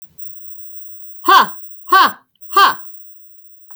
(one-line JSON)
{"exhalation_length": "3.8 s", "exhalation_amplitude": 32768, "exhalation_signal_mean_std_ratio": 0.62, "survey_phase": "beta (2021-08-13 to 2022-03-07)", "age": "45-64", "gender": "Female", "wearing_mask": "No", "symptom_none": true, "smoker_status": "Ex-smoker", "respiratory_condition_asthma": false, "respiratory_condition_other": false, "recruitment_source": "REACT", "submission_delay": "1 day", "covid_test_result": "Negative", "covid_test_method": "RT-qPCR", "influenza_a_test_result": "Negative", "influenza_b_test_result": "Negative"}